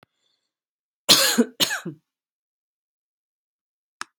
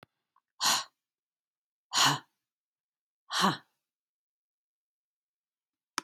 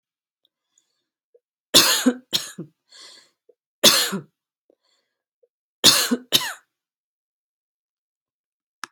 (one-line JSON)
{"cough_length": "4.2 s", "cough_amplitude": 32598, "cough_signal_mean_std_ratio": 0.26, "exhalation_length": "6.0 s", "exhalation_amplitude": 9720, "exhalation_signal_mean_std_ratio": 0.26, "three_cough_length": "8.9 s", "three_cough_amplitude": 32767, "three_cough_signal_mean_std_ratio": 0.27, "survey_phase": "alpha (2021-03-01 to 2021-08-12)", "age": "45-64", "gender": "Female", "wearing_mask": "No", "symptom_fatigue": true, "smoker_status": "Never smoked", "respiratory_condition_asthma": false, "respiratory_condition_other": false, "recruitment_source": "REACT", "submission_delay": "1 day", "covid_test_result": "Negative", "covid_test_method": "RT-qPCR"}